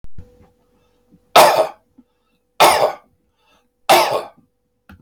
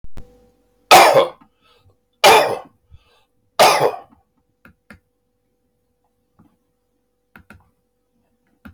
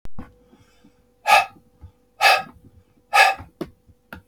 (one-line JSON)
{"three_cough_length": "5.0 s", "three_cough_amplitude": 32768, "three_cough_signal_mean_std_ratio": 0.37, "cough_length": "8.7 s", "cough_amplitude": 32768, "cough_signal_mean_std_ratio": 0.29, "exhalation_length": "4.3 s", "exhalation_amplitude": 30476, "exhalation_signal_mean_std_ratio": 0.35, "survey_phase": "beta (2021-08-13 to 2022-03-07)", "age": "65+", "gender": "Male", "wearing_mask": "No", "symptom_none": true, "smoker_status": "Ex-smoker", "respiratory_condition_asthma": false, "respiratory_condition_other": false, "recruitment_source": "REACT", "submission_delay": "3 days", "covid_test_result": "Negative", "covid_test_method": "RT-qPCR", "influenza_a_test_result": "Negative", "influenza_b_test_result": "Negative"}